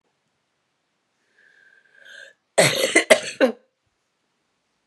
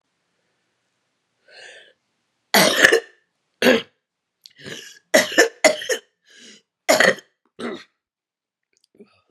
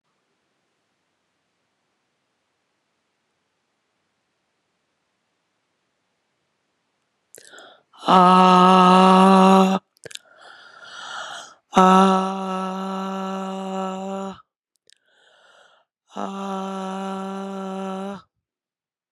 {"cough_length": "4.9 s", "cough_amplitude": 32767, "cough_signal_mean_std_ratio": 0.27, "three_cough_length": "9.3 s", "three_cough_amplitude": 32768, "three_cough_signal_mean_std_ratio": 0.31, "exhalation_length": "19.1 s", "exhalation_amplitude": 32767, "exhalation_signal_mean_std_ratio": 0.33, "survey_phase": "beta (2021-08-13 to 2022-03-07)", "age": "45-64", "gender": "Female", "wearing_mask": "No", "symptom_cough_any": true, "symptom_runny_or_blocked_nose": true, "symptom_shortness_of_breath": true, "symptom_sore_throat": true, "symptom_fatigue": true, "symptom_change_to_sense_of_smell_or_taste": true, "symptom_loss_of_taste": true, "symptom_onset": "3 days", "smoker_status": "Never smoked", "respiratory_condition_asthma": true, "respiratory_condition_other": false, "recruitment_source": "Test and Trace", "submission_delay": "1 day", "covid_test_result": "Positive", "covid_test_method": "RT-qPCR", "covid_ct_value": 21.1, "covid_ct_gene": "ORF1ab gene", "covid_ct_mean": 21.8, "covid_viral_load": "73000 copies/ml", "covid_viral_load_category": "Low viral load (10K-1M copies/ml)"}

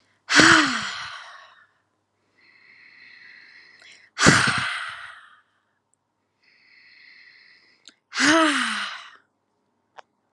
{"exhalation_length": "10.3 s", "exhalation_amplitude": 32768, "exhalation_signal_mean_std_ratio": 0.34, "survey_phase": "alpha (2021-03-01 to 2021-08-12)", "age": "18-44", "gender": "Female", "wearing_mask": "No", "symptom_abdominal_pain": true, "smoker_status": "Ex-smoker", "respiratory_condition_asthma": true, "respiratory_condition_other": false, "recruitment_source": "REACT", "submission_delay": "1 day", "covid_test_result": "Negative", "covid_test_method": "RT-qPCR"}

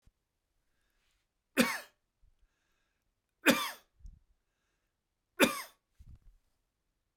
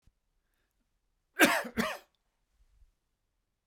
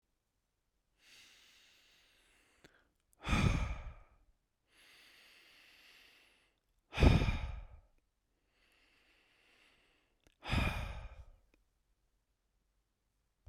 {"three_cough_length": "7.2 s", "three_cough_amplitude": 10897, "three_cough_signal_mean_std_ratio": 0.21, "cough_length": "3.7 s", "cough_amplitude": 13741, "cough_signal_mean_std_ratio": 0.24, "exhalation_length": "13.5 s", "exhalation_amplitude": 6857, "exhalation_signal_mean_std_ratio": 0.27, "survey_phase": "beta (2021-08-13 to 2022-03-07)", "age": "65+", "gender": "Male", "wearing_mask": "No", "symptom_none": true, "smoker_status": "Never smoked", "respiratory_condition_asthma": false, "respiratory_condition_other": false, "recruitment_source": "REACT", "submission_delay": "1 day", "covid_test_result": "Negative", "covid_test_method": "RT-qPCR"}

